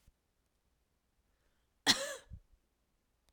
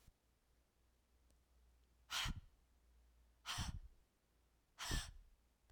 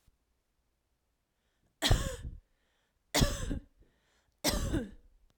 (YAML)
cough_length: 3.3 s
cough_amplitude: 7705
cough_signal_mean_std_ratio: 0.19
exhalation_length: 5.7 s
exhalation_amplitude: 1232
exhalation_signal_mean_std_ratio: 0.38
three_cough_length: 5.4 s
three_cough_amplitude: 7865
three_cough_signal_mean_std_ratio: 0.36
survey_phase: beta (2021-08-13 to 2022-03-07)
age: 18-44
gender: Female
wearing_mask: 'No'
symptom_cough_any: true
symptom_runny_or_blocked_nose: true
symptom_fatigue: true
symptom_onset: 3 days
smoker_status: Prefer not to say
respiratory_condition_asthma: false
respiratory_condition_other: false
recruitment_source: Test and Trace
submission_delay: 1 day
covid_test_result: Negative
covid_test_method: RT-qPCR